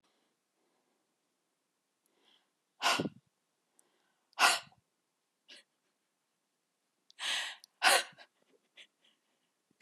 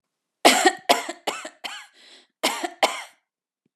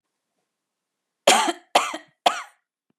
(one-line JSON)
{"exhalation_length": "9.8 s", "exhalation_amplitude": 10037, "exhalation_signal_mean_std_ratio": 0.23, "cough_length": "3.8 s", "cough_amplitude": 31088, "cough_signal_mean_std_ratio": 0.35, "three_cough_length": "3.0 s", "three_cough_amplitude": 27738, "three_cough_signal_mean_std_ratio": 0.3, "survey_phase": "beta (2021-08-13 to 2022-03-07)", "age": "45-64", "gender": "Female", "wearing_mask": "No", "symptom_cough_any": true, "symptom_shortness_of_breath": true, "symptom_abdominal_pain": true, "symptom_diarrhoea": true, "symptom_fatigue": true, "smoker_status": "Ex-smoker", "respiratory_condition_asthma": false, "respiratory_condition_other": false, "recruitment_source": "REACT", "submission_delay": "1 day", "covid_test_result": "Negative", "covid_test_method": "RT-qPCR", "influenza_a_test_result": "Unknown/Void", "influenza_b_test_result": "Unknown/Void"}